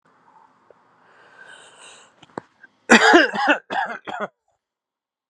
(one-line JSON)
{"cough_length": "5.3 s", "cough_amplitude": 32767, "cough_signal_mean_std_ratio": 0.31, "survey_phase": "beta (2021-08-13 to 2022-03-07)", "age": "18-44", "gender": "Male", "wearing_mask": "No", "symptom_runny_or_blocked_nose": true, "symptom_shortness_of_breath": true, "symptom_fatigue": true, "symptom_headache": true, "symptom_change_to_sense_of_smell_or_taste": true, "symptom_loss_of_taste": true, "smoker_status": "Ex-smoker", "respiratory_condition_asthma": false, "respiratory_condition_other": false, "recruitment_source": "Test and Trace", "submission_delay": "2 days", "covid_test_result": "Positive", "covid_test_method": "RT-qPCR", "covid_ct_value": 15.6, "covid_ct_gene": "ORF1ab gene", "covid_ct_mean": 15.6, "covid_viral_load": "7500000 copies/ml", "covid_viral_load_category": "High viral load (>1M copies/ml)"}